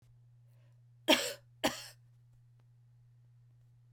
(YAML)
cough_length: 3.9 s
cough_amplitude: 9670
cough_signal_mean_std_ratio: 0.26
survey_phase: beta (2021-08-13 to 2022-03-07)
age: 45-64
gender: Female
wearing_mask: 'No'
symptom_cough_any: true
symptom_runny_or_blocked_nose: true
symptom_onset: 4 days
smoker_status: Never smoked
respiratory_condition_asthma: false
respiratory_condition_other: false
recruitment_source: Test and Trace
submission_delay: 3 days
covid_test_result: Positive
covid_test_method: RT-qPCR
covid_ct_value: 14.8
covid_ct_gene: N gene
covid_ct_mean: 15.1
covid_viral_load: 11000000 copies/ml
covid_viral_load_category: High viral load (>1M copies/ml)